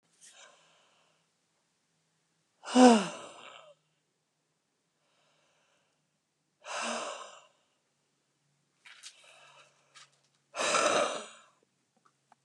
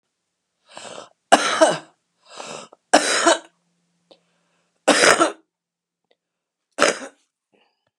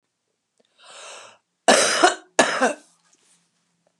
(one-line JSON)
{"exhalation_length": "12.4 s", "exhalation_amplitude": 14773, "exhalation_signal_mean_std_ratio": 0.23, "three_cough_length": "8.0 s", "three_cough_amplitude": 32768, "three_cough_signal_mean_std_ratio": 0.32, "cough_length": "4.0 s", "cough_amplitude": 30988, "cough_signal_mean_std_ratio": 0.34, "survey_phase": "beta (2021-08-13 to 2022-03-07)", "age": "65+", "gender": "Female", "wearing_mask": "No", "symptom_cough_any": true, "symptom_runny_or_blocked_nose": true, "symptom_onset": "12 days", "smoker_status": "Current smoker (11 or more cigarettes per day)", "respiratory_condition_asthma": true, "respiratory_condition_other": false, "recruitment_source": "REACT", "submission_delay": "3 days", "covid_test_result": "Negative", "covid_test_method": "RT-qPCR", "influenza_a_test_result": "Unknown/Void", "influenza_b_test_result": "Unknown/Void"}